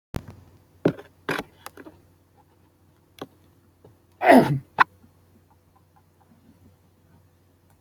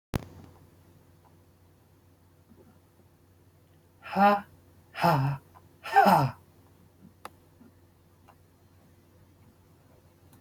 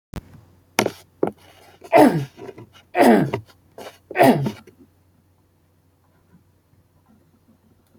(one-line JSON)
{"cough_length": "7.8 s", "cough_amplitude": 27286, "cough_signal_mean_std_ratio": 0.21, "exhalation_length": "10.4 s", "exhalation_amplitude": 12829, "exhalation_signal_mean_std_ratio": 0.28, "three_cough_length": "8.0 s", "three_cough_amplitude": 28655, "three_cough_signal_mean_std_ratio": 0.31, "survey_phase": "beta (2021-08-13 to 2022-03-07)", "age": "18-44", "gender": "Male", "wearing_mask": "No", "symptom_none": true, "smoker_status": "Never smoked", "respiratory_condition_asthma": false, "respiratory_condition_other": false, "recruitment_source": "REACT", "submission_delay": "2 days", "covid_test_result": "Negative", "covid_test_method": "RT-qPCR", "influenza_a_test_result": "Negative", "influenza_b_test_result": "Negative"}